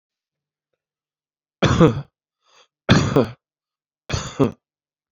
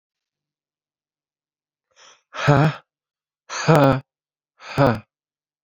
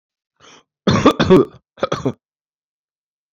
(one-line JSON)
{"three_cough_length": "5.1 s", "three_cough_amplitude": 27978, "three_cough_signal_mean_std_ratio": 0.32, "exhalation_length": "5.6 s", "exhalation_amplitude": 32767, "exhalation_signal_mean_std_ratio": 0.3, "cough_length": "3.3 s", "cough_amplitude": 27560, "cough_signal_mean_std_ratio": 0.35, "survey_phase": "beta (2021-08-13 to 2022-03-07)", "age": "18-44", "gender": "Male", "wearing_mask": "No", "symptom_none": true, "smoker_status": "Never smoked", "respiratory_condition_asthma": false, "respiratory_condition_other": false, "recruitment_source": "REACT", "submission_delay": "1 day", "covid_test_result": "Negative", "covid_test_method": "RT-qPCR", "influenza_a_test_result": "Negative", "influenza_b_test_result": "Negative"}